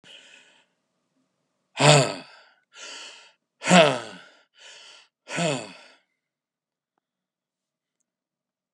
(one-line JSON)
{"exhalation_length": "8.7 s", "exhalation_amplitude": 28923, "exhalation_signal_mean_std_ratio": 0.26, "survey_phase": "beta (2021-08-13 to 2022-03-07)", "age": "65+", "gender": "Male", "wearing_mask": "No", "symptom_cough_any": true, "smoker_status": "Ex-smoker", "respiratory_condition_asthma": false, "respiratory_condition_other": false, "recruitment_source": "REACT", "submission_delay": "1 day", "covid_test_result": "Negative", "covid_test_method": "RT-qPCR"}